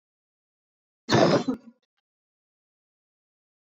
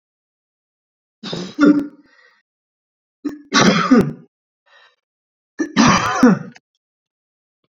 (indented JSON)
{
  "cough_length": "3.8 s",
  "cough_amplitude": 15945,
  "cough_signal_mean_std_ratio": 0.26,
  "three_cough_length": "7.7 s",
  "three_cough_amplitude": 31774,
  "three_cough_signal_mean_std_ratio": 0.37,
  "survey_phase": "alpha (2021-03-01 to 2021-08-12)",
  "age": "18-44",
  "gender": "Male",
  "wearing_mask": "No",
  "symptom_cough_any": true,
  "symptom_headache": true,
  "symptom_change_to_sense_of_smell_or_taste": true,
  "symptom_onset": "8 days",
  "smoker_status": "Never smoked",
  "respiratory_condition_asthma": false,
  "respiratory_condition_other": false,
  "recruitment_source": "Test and Trace",
  "submission_delay": "2 days",
  "covid_test_result": "Positive",
  "covid_test_method": "RT-qPCR",
  "covid_ct_value": 18.6,
  "covid_ct_gene": "N gene",
  "covid_ct_mean": 18.8,
  "covid_viral_load": "700000 copies/ml",
  "covid_viral_load_category": "Low viral load (10K-1M copies/ml)"
}